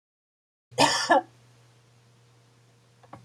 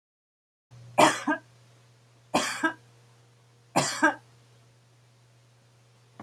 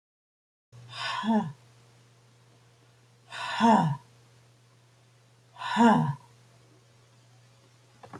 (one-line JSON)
{"cough_length": "3.2 s", "cough_amplitude": 14580, "cough_signal_mean_std_ratio": 0.29, "three_cough_length": "6.2 s", "three_cough_amplitude": 15787, "three_cough_signal_mean_std_ratio": 0.31, "exhalation_length": "8.2 s", "exhalation_amplitude": 11192, "exhalation_signal_mean_std_ratio": 0.35, "survey_phase": "beta (2021-08-13 to 2022-03-07)", "age": "65+", "gender": "Female", "wearing_mask": "No", "symptom_none": true, "smoker_status": "Never smoked", "respiratory_condition_asthma": false, "respiratory_condition_other": false, "recruitment_source": "REACT", "submission_delay": "2 days", "covid_test_result": "Negative", "covid_test_method": "RT-qPCR", "influenza_a_test_result": "Negative", "influenza_b_test_result": "Negative"}